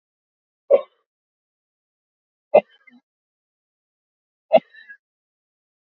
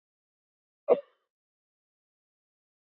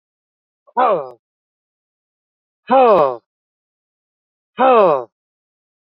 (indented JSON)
{
  "three_cough_length": "5.8 s",
  "three_cough_amplitude": 28760,
  "three_cough_signal_mean_std_ratio": 0.15,
  "cough_length": "2.9 s",
  "cough_amplitude": 10742,
  "cough_signal_mean_std_ratio": 0.13,
  "exhalation_length": "5.8 s",
  "exhalation_amplitude": 28475,
  "exhalation_signal_mean_std_ratio": 0.34,
  "survey_phase": "beta (2021-08-13 to 2022-03-07)",
  "age": "45-64",
  "gender": "Male",
  "wearing_mask": "No",
  "symptom_fatigue": true,
  "smoker_status": "Never smoked",
  "respiratory_condition_asthma": true,
  "respiratory_condition_other": false,
  "recruitment_source": "REACT",
  "submission_delay": "2 days",
  "covid_test_result": "Negative",
  "covid_test_method": "RT-qPCR",
  "influenza_a_test_result": "Negative",
  "influenza_b_test_result": "Negative"
}